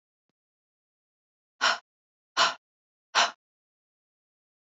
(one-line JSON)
{"exhalation_length": "4.6 s", "exhalation_amplitude": 12823, "exhalation_signal_mean_std_ratio": 0.24, "survey_phase": "beta (2021-08-13 to 2022-03-07)", "age": "45-64", "gender": "Female", "wearing_mask": "No", "symptom_sore_throat": true, "symptom_abdominal_pain": true, "symptom_fatigue": true, "smoker_status": "Never smoked", "respiratory_condition_asthma": false, "respiratory_condition_other": false, "recruitment_source": "REACT", "submission_delay": "1 day", "covid_test_result": "Negative", "covid_test_method": "RT-qPCR"}